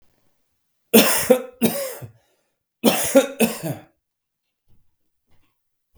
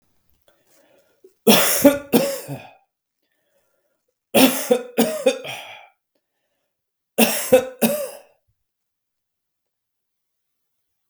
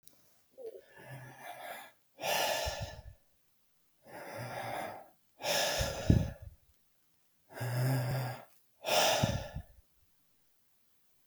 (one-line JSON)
{"cough_length": "6.0 s", "cough_amplitude": 32768, "cough_signal_mean_std_ratio": 0.35, "three_cough_length": "11.1 s", "three_cough_amplitude": 32768, "three_cough_signal_mean_std_ratio": 0.33, "exhalation_length": "11.3 s", "exhalation_amplitude": 11013, "exhalation_signal_mean_std_ratio": 0.49, "survey_phase": "beta (2021-08-13 to 2022-03-07)", "age": "45-64", "gender": "Male", "wearing_mask": "No", "symptom_cough_any": true, "symptom_new_continuous_cough": true, "smoker_status": "Never smoked", "respiratory_condition_asthma": false, "respiratory_condition_other": false, "recruitment_source": "REACT", "submission_delay": "2 days", "covid_test_result": "Negative", "covid_test_method": "RT-qPCR"}